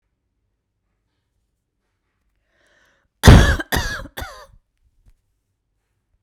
{"cough_length": "6.2 s", "cough_amplitude": 32768, "cough_signal_mean_std_ratio": 0.21, "survey_phase": "beta (2021-08-13 to 2022-03-07)", "age": "45-64", "gender": "Female", "wearing_mask": "No", "symptom_cough_any": true, "smoker_status": "Never smoked", "respiratory_condition_asthma": false, "respiratory_condition_other": true, "recruitment_source": "REACT", "submission_delay": "1 day", "covid_test_result": "Negative", "covid_test_method": "RT-qPCR"}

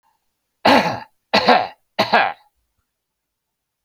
{"three_cough_length": "3.8 s", "three_cough_amplitude": 28668, "three_cough_signal_mean_std_ratio": 0.38, "survey_phase": "beta (2021-08-13 to 2022-03-07)", "age": "45-64", "gender": "Male", "wearing_mask": "No", "symptom_none": true, "smoker_status": "Never smoked", "respiratory_condition_asthma": false, "respiratory_condition_other": false, "recruitment_source": "REACT", "submission_delay": "3 days", "covid_test_result": "Negative", "covid_test_method": "RT-qPCR"}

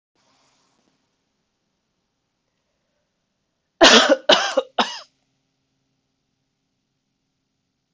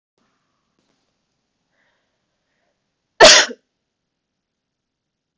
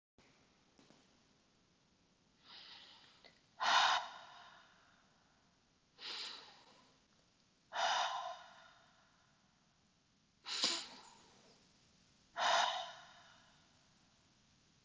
{"three_cough_length": "7.9 s", "three_cough_amplitude": 32768, "three_cough_signal_mean_std_ratio": 0.22, "cough_length": "5.4 s", "cough_amplitude": 32768, "cough_signal_mean_std_ratio": 0.17, "exhalation_length": "14.8 s", "exhalation_amplitude": 4174, "exhalation_signal_mean_std_ratio": 0.33, "survey_phase": "beta (2021-08-13 to 2022-03-07)", "age": "18-44", "gender": "Female", "wearing_mask": "No", "symptom_cough_any": true, "symptom_sore_throat": true, "symptom_fatigue": true, "symptom_fever_high_temperature": true, "symptom_headache": true, "smoker_status": "Never smoked", "respiratory_condition_asthma": true, "respiratory_condition_other": false, "recruitment_source": "Test and Trace", "submission_delay": "2 days", "covid_test_result": "Positive", "covid_test_method": "RT-qPCR", "covid_ct_value": 18.2, "covid_ct_gene": "ORF1ab gene"}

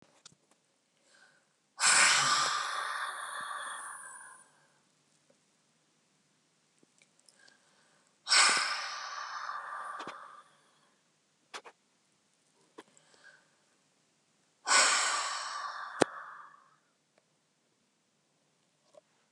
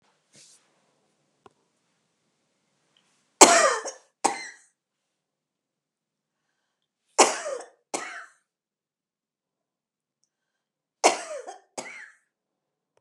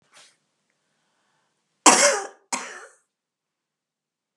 {"exhalation_length": "19.3 s", "exhalation_amplitude": 18921, "exhalation_signal_mean_std_ratio": 0.35, "three_cough_length": "13.0 s", "three_cough_amplitude": 32768, "three_cough_signal_mean_std_ratio": 0.2, "cough_length": "4.4 s", "cough_amplitude": 32768, "cough_signal_mean_std_ratio": 0.23, "survey_phase": "beta (2021-08-13 to 2022-03-07)", "age": "65+", "gender": "Female", "wearing_mask": "No", "symptom_none": true, "smoker_status": "Never smoked", "respiratory_condition_asthma": false, "respiratory_condition_other": false, "recruitment_source": "REACT", "submission_delay": "1 day", "covid_test_result": "Negative", "covid_test_method": "RT-qPCR", "influenza_a_test_result": "Negative", "influenza_b_test_result": "Negative"}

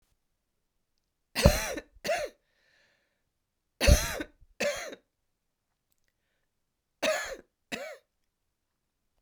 {"cough_length": "9.2 s", "cough_amplitude": 24554, "cough_signal_mean_std_ratio": 0.27, "survey_phase": "beta (2021-08-13 to 2022-03-07)", "age": "45-64", "gender": "Female", "wearing_mask": "No", "symptom_cough_any": true, "symptom_runny_or_blocked_nose": true, "symptom_shortness_of_breath": true, "symptom_sore_throat": true, "symptom_onset": "4 days", "smoker_status": "Never smoked", "respiratory_condition_asthma": false, "respiratory_condition_other": false, "recruitment_source": "Test and Trace", "submission_delay": "1 day", "covid_test_result": "Positive", "covid_test_method": "RT-qPCR", "covid_ct_value": 16.5, "covid_ct_gene": "ORF1ab gene"}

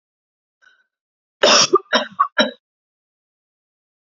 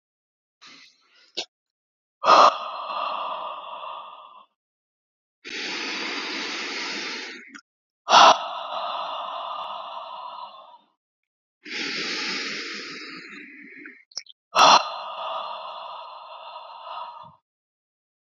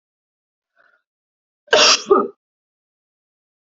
{"three_cough_length": "4.2 s", "three_cough_amplitude": 30902, "three_cough_signal_mean_std_ratio": 0.3, "exhalation_length": "18.3 s", "exhalation_amplitude": 28067, "exhalation_signal_mean_std_ratio": 0.38, "cough_length": "3.8 s", "cough_amplitude": 31891, "cough_signal_mean_std_ratio": 0.27, "survey_phase": "beta (2021-08-13 to 2022-03-07)", "age": "18-44", "gender": "Female", "wearing_mask": "No", "symptom_none": true, "smoker_status": "Never smoked", "respiratory_condition_asthma": false, "respiratory_condition_other": false, "recruitment_source": "REACT", "submission_delay": "2 days", "covid_test_result": "Negative", "covid_test_method": "RT-qPCR", "influenza_a_test_result": "Negative", "influenza_b_test_result": "Negative"}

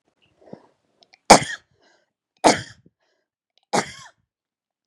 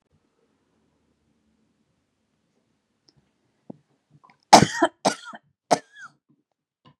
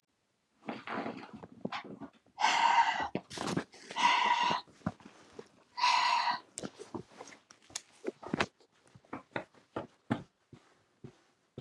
{"three_cough_length": "4.9 s", "three_cough_amplitude": 32768, "three_cough_signal_mean_std_ratio": 0.19, "cough_length": "7.0 s", "cough_amplitude": 32768, "cough_signal_mean_std_ratio": 0.16, "exhalation_length": "11.6 s", "exhalation_amplitude": 10432, "exhalation_signal_mean_std_ratio": 0.45, "survey_phase": "beta (2021-08-13 to 2022-03-07)", "age": "45-64", "gender": "Female", "wearing_mask": "No", "symptom_none": true, "smoker_status": "Never smoked", "respiratory_condition_asthma": false, "respiratory_condition_other": false, "recruitment_source": "REACT", "submission_delay": "3 days", "covid_test_result": "Negative", "covid_test_method": "RT-qPCR", "influenza_a_test_result": "Negative", "influenza_b_test_result": "Negative"}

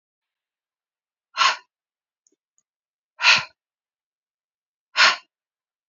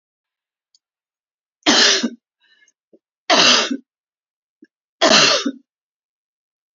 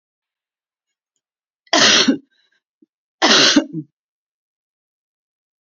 {"exhalation_length": "5.9 s", "exhalation_amplitude": 26048, "exhalation_signal_mean_std_ratio": 0.23, "three_cough_length": "6.7 s", "three_cough_amplitude": 32248, "three_cough_signal_mean_std_ratio": 0.35, "cough_length": "5.6 s", "cough_amplitude": 32767, "cough_signal_mean_std_ratio": 0.32, "survey_phase": "beta (2021-08-13 to 2022-03-07)", "age": "45-64", "gender": "Female", "wearing_mask": "No", "symptom_none": true, "smoker_status": "Ex-smoker", "respiratory_condition_asthma": false, "respiratory_condition_other": false, "recruitment_source": "REACT", "submission_delay": "2 days", "covid_test_result": "Negative", "covid_test_method": "RT-qPCR", "influenza_a_test_result": "Negative", "influenza_b_test_result": "Negative"}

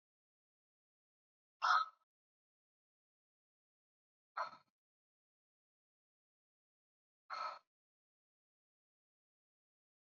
{"exhalation_length": "10.1 s", "exhalation_amplitude": 2767, "exhalation_signal_mean_std_ratio": 0.17, "survey_phase": "beta (2021-08-13 to 2022-03-07)", "age": "18-44", "gender": "Female", "wearing_mask": "No", "symptom_runny_or_blocked_nose": true, "smoker_status": "Never smoked", "respiratory_condition_asthma": false, "respiratory_condition_other": false, "recruitment_source": "Test and Trace", "submission_delay": "2 days", "covid_test_result": "Positive", "covid_test_method": "RT-qPCR", "covid_ct_value": 22.5, "covid_ct_gene": "ORF1ab gene", "covid_ct_mean": 23.0, "covid_viral_load": "29000 copies/ml", "covid_viral_load_category": "Low viral load (10K-1M copies/ml)"}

